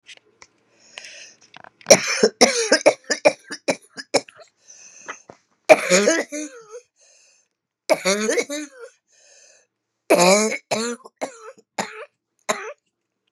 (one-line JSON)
{"three_cough_length": "13.3 s", "three_cough_amplitude": 32768, "three_cough_signal_mean_std_ratio": 0.35, "survey_phase": "beta (2021-08-13 to 2022-03-07)", "age": "65+", "gender": "Female", "wearing_mask": "No", "symptom_cough_any": true, "symptom_runny_or_blocked_nose": true, "symptom_shortness_of_breath": true, "symptom_fatigue": true, "symptom_headache": true, "symptom_other": true, "symptom_onset": "3 days", "smoker_status": "Ex-smoker", "respiratory_condition_asthma": false, "respiratory_condition_other": false, "recruitment_source": "Test and Trace", "submission_delay": "1 day", "covid_test_result": "Positive", "covid_test_method": "ePCR"}